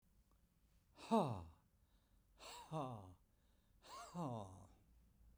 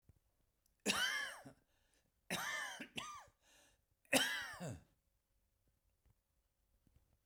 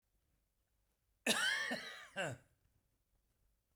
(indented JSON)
{
  "exhalation_length": "5.4 s",
  "exhalation_amplitude": 1903,
  "exhalation_signal_mean_std_ratio": 0.38,
  "three_cough_length": "7.3 s",
  "three_cough_amplitude": 4731,
  "three_cough_signal_mean_std_ratio": 0.37,
  "cough_length": "3.8 s",
  "cough_amplitude": 2956,
  "cough_signal_mean_std_ratio": 0.38,
  "survey_phase": "beta (2021-08-13 to 2022-03-07)",
  "age": "65+",
  "gender": "Male",
  "wearing_mask": "No",
  "symptom_none": true,
  "smoker_status": "Ex-smoker",
  "respiratory_condition_asthma": false,
  "respiratory_condition_other": false,
  "recruitment_source": "REACT",
  "submission_delay": "2 days",
  "covid_test_result": "Negative",
  "covid_test_method": "RT-qPCR"
}